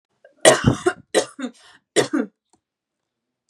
three_cough_length: 3.5 s
three_cough_amplitude: 32767
three_cough_signal_mean_std_ratio: 0.33
survey_phase: beta (2021-08-13 to 2022-03-07)
age: 18-44
gender: Female
wearing_mask: 'No'
symptom_none: true
smoker_status: Never smoked
respiratory_condition_asthma: false
respiratory_condition_other: false
recruitment_source: Test and Trace
submission_delay: 1 day
covid_test_result: Negative
covid_test_method: ePCR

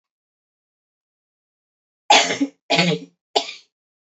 three_cough_length: 4.0 s
three_cough_amplitude: 32768
three_cough_signal_mean_std_ratio: 0.31
survey_phase: beta (2021-08-13 to 2022-03-07)
age: 18-44
gender: Female
wearing_mask: 'No'
symptom_shortness_of_breath: true
symptom_sore_throat: true
symptom_abdominal_pain: true
symptom_diarrhoea: true
symptom_fatigue: true
symptom_headache: true
smoker_status: Never smoked
respiratory_condition_asthma: true
respiratory_condition_other: false
recruitment_source: REACT
submission_delay: 2 days
covid_test_result: Negative
covid_test_method: RT-qPCR
influenza_a_test_result: Negative
influenza_b_test_result: Negative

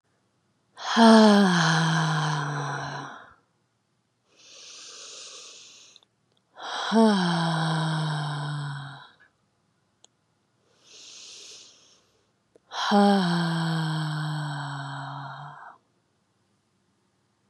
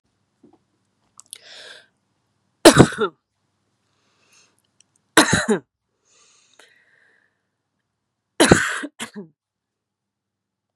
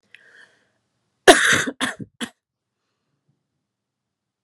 exhalation_length: 17.5 s
exhalation_amplitude: 22686
exhalation_signal_mean_std_ratio: 0.48
three_cough_length: 10.8 s
three_cough_amplitude: 32768
three_cough_signal_mean_std_ratio: 0.22
cough_length: 4.4 s
cough_amplitude: 32768
cough_signal_mean_std_ratio: 0.23
survey_phase: beta (2021-08-13 to 2022-03-07)
age: 18-44
gender: Female
wearing_mask: 'No'
symptom_cough_any: true
symptom_new_continuous_cough: true
symptom_sore_throat: true
symptom_fatigue: true
symptom_onset: 4 days
smoker_status: Never smoked
respiratory_condition_asthma: false
respiratory_condition_other: false
recruitment_source: Test and Trace
submission_delay: 1 day
covid_test_result: Positive
covid_test_method: RT-qPCR
covid_ct_value: 27.4
covid_ct_gene: ORF1ab gene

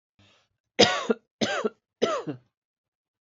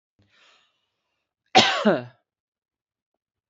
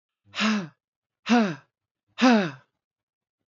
three_cough_length: 3.2 s
three_cough_amplitude: 23463
three_cough_signal_mean_std_ratio: 0.35
cough_length: 3.5 s
cough_amplitude: 26278
cough_signal_mean_std_ratio: 0.25
exhalation_length: 3.5 s
exhalation_amplitude: 13780
exhalation_signal_mean_std_ratio: 0.4
survey_phase: beta (2021-08-13 to 2022-03-07)
age: 45-64
gender: Female
wearing_mask: 'No'
symptom_runny_or_blocked_nose: true
symptom_diarrhoea: true
smoker_status: Never smoked
respiratory_condition_asthma: false
respiratory_condition_other: false
recruitment_source: REACT
submission_delay: 10 days
covid_test_result: Negative
covid_test_method: RT-qPCR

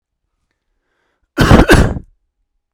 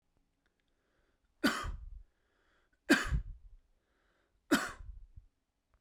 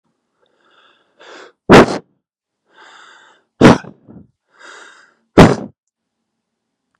cough_length: 2.7 s
cough_amplitude: 32768
cough_signal_mean_std_ratio: 0.36
three_cough_length: 5.8 s
three_cough_amplitude: 8063
three_cough_signal_mean_std_ratio: 0.3
exhalation_length: 7.0 s
exhalation_amplitude: 32768
exhalation_signal_mean_std_ratio: 0.24
survey_phase: beta (2021-08-13 to 2022-03-07)
age: 18-44
gender: Male
wearing_mask: 'No'
symptom_none: true
symptom_onset: 7 days
smoker_status: Never smoked
respiratory_condition_asthma: false
respiratory_condition_other: false
recruitment_source: REACT
submission_delay: 0 days
covid_test_result: Negative
covid_test_method: RT-qPCR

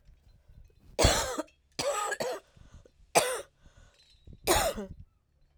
three_cough_length: 5.6 s
three_cough_amplitude: 13793
three_cough_signal_mean_std_ratio: 0.42
survey_phase: alpha (2021-03-01 to 2021-08-12)
age: 45-64
gender: Female
wearing_mask: 'No'
symptom_cough_any: true
symptom_change_to_sense_of_smell_or_taste: true
symptom_onset: 3 days
smoker_status: Never smoked
respiratory_condition_asthma: false
respiratory_condition_other: false
recruitment_source: Test and Trace
submission_delay: 1 day
covid_test_result: Positive
covid_test_method: RT-qPCR
covid_ct_value: 23.8
covid_ct_gene: ORF1ab gene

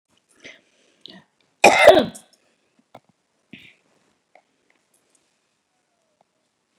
cough_length: 6.8 s
cough_amplitude: 32768
cough_signal_mean_std_ratio: 0.19
survey_phase: beta (2021-08-13 to 2022-03-07)
age: 65+
gender: Female
wearing_mask: 'No'
symptom_none: true
smoker_status: Never smoked
respiratory_condition_asthma: false
respiratory_condition_other: false
recruitment_source: REACT
submission_delay: 3 days
covid_test_result: Negative
covid_test_method: RT-qPCR
influenza_a_test_result: Negative
influenza_b_test_result: Negative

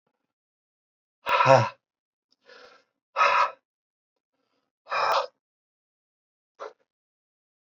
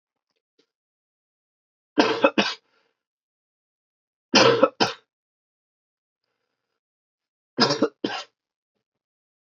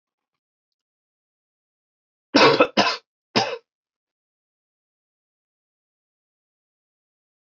exhalation_length: 7.7 s
exhalation_amplitude: 23769
exhalation_signal_mean_std_ratio: 0.28
three_cough_length: 9.6 s
three_cough_amplitude: 26436
three_cough_signal_mean_std_ratio: 0.26
cough_length: 7.5 s
cough_amplitude: 24206
cough_signal_mean_std_ratio: 0.22
survey_phase: beta (2021-08-13 to 2022-03-07)
age: 45-64
gender: Male
wearing_mask: 'No'
symptom_cough_any: true
symptom_runny_or_blocked_nose: true
symptom_sore_throat: true
symptom_fatigue: true
symptom_headache: true
symptom_onset: 4 days
smoker_status: Never smoked
respiratory_condition_asthma: false
respiratory_condition_other: false
recruitment_source: Test and Trace
submission_delay: 1 day
covid_test_result: Positive
covid_test_method: RT-qPCR
covid_ct_value: 22.2
covid_ct_gene: N gene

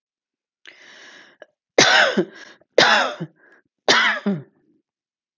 three_cough_length: 5.4 s
three_cough_amplitude: 32766
three_cough_signal_mean_std_ratio: 0.39
survey_phase: alpha (2021-03-01 to 2021-08-12)
age: 45-64
gender: Female
wearing_mask: 'No'
symptom_cough_any: true
symptom_fatigue: true
smoker_status: Never smoked
respiratory_condition_asthma: false
respiratory_condition_other: false
recruitment_source: REACT
submission_delay: 2 days
covid_test_result: Negative
covid_test_method: RT-qPCR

